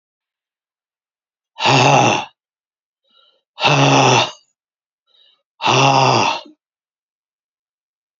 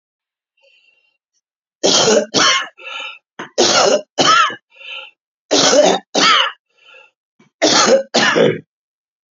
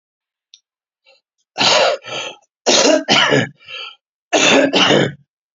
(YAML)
exhalation_length: 8.2 s
exhalation_amplitude: 32734
exhalation_signal_mean_std_ratio: 0.42
three_cough_length: 9.3 s
three_cough_amplitude: 32768
three_cough_signal_mean_std_ratio: 0.52
cough_length: 5.5 s
cough_amplitude: 32077
cough_signal_mean_std_ratio: 0.53
survey_phase: beta (2021-08-13 to 2022-03-07)
age: 65+
gender: Male
wearing_mask: 'Yes'
symptom_cough_any: true
symptom_runny_or_blocked_nose: true
symptom_abdominal_pain: true
symptom_diarrhoea: true
symptom_fatigue: true
symptom_headache: true
symptom_change_to_sense_of_smell_or_taste: true
symptom_onset: 7 days
smoker_status: Never smoked
respiratory_condition_asthma: true
respiratory_condition_other: false
recruitment_source: REACT
submission_delay: 3 days
covid_test_result: Negative
covid_test_method: RT-qPCR
influenza_a_test_result: Negative
influenza_b_test_result: Negative